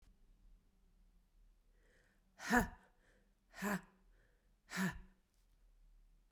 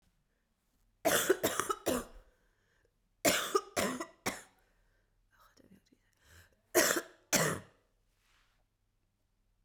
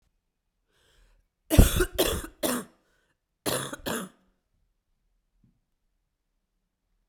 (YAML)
exhalation_length: 6.3 s
exhalation_amplitude: 4668
exhalation_signal_mean_std_ratio: 0.28
three_cough_length: 9.6 s
three_cough_amplitude: 9006
three_cough_signal_mean_std_ratio: 0.35
cough_length: 7.1 s
cough_amplitude: 26806
cough_signal_mean_std_ratio: 0.26
survey_phase: beta (2021-08-13 to 2022-03-07)
age: 18-44
gender: Female
wearing_mask: 'No'
symptom_cough_any: true
symptom_runny_or_blocked_nose: true
symptom_shortness_of_breath: true
symptom_abdominal_pain: true
symptom_fatigue: true
symptom_headache: true
symptom_other: true
symptom_onset: 3 days
smoker_status: Never smoked
respiratory_condition_asthma: false
respiratory_condition_other: false
recruitment_source: Test and Trace
submission_delay: 2 days
covid_test_result: Positive
covid_test_method: RT-qPCR
covid_ct_value: 30.7
covid_ct_gene: ORF1ab gene
covid_ct_mean: 31.4
covid_viral_load: 50 copies/ml
covid_viral_load_category: Minimal viral load (< 10K copies/ml)